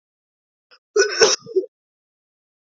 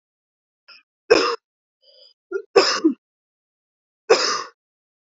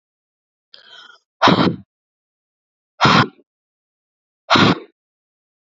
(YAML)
cough_length: 2.6 s
cough_amplitude: 32768
cough_signal_mean_std_ratio: 0.32
three_cough_length: 5.1 s
three_cough_amplitude: 32767
three_cough_signal_mean_std_ratio: 0.31
exhalation_length: 5.6 s
exhalation_amplitude: 31580
exhalation_signal_mean_std_ratio: 0.31
survey_phase: alpha (2021-03-01 to 2021-08-12)
age: 18-44
gender: Female
wearing_mask: 'No'
symptom_headache: true
smoker_status: Never smoked
respiratory_condition_asthma: false
respiratory_condition_other: false
recruitment_source: Test and Trace
submission_delay: 2 days
covid_test_result: Positive
covid_test_method: RT-qPCR
covid_ct_value: 17.9
covid_ct_gene: ORF1ab gene
covid_ct_mean: 17.9
covid_viral_load: 1300000 copies/ml
covid_viral_load_category: High viral load (>1M copies/ml)